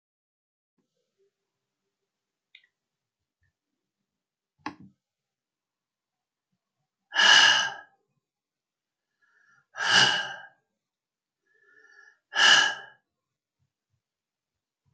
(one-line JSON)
{"exhalation_length": "14.9 s", "exhalation_amplitude": 19964, "exhalation_signal_mean_std_ratio": 0.24, "survey_phase": "alpha (2021-03-01 to 2021-08-12)", "age": "65+", "gender": "Male", "wearing_mask": "No", "symptom_none": true, "smoker_status": "Never smoked", "respiratory_condition_asthma": false, "respiratory_condition_other": false, "recruitment_source": "REACT", "submission_delay": "2 days", "covid_test_result": "Negative", "covid_test_method": "RT-qPCR"}